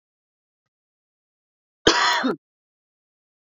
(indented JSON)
{
  "cough_length": "3.6 s",
  "cough_amplitude": 26991,
  "cough_signal_mean_std_ratio": 0.28,
  "survey_phase": "beta (2021-08-13 to 2022-03-07)",
  "age": "18-44",
  "gender": "Female",
  "wearing_mask": "No",
  "symptom_cough_any": true,
  "symptom_loss_of_taste": true,
  "symptom_onset": "12 days",
  "smoker_status": "Never smoked",
  "respiratory_condition_asthma": false,
  "respiratory_condition_other": false,
  "recruitment_source": "REACT",
  "submission_delay": "1 day",
  "covid_test_result": "Negative",
  "covid_test_method": "RT-qPCR"
}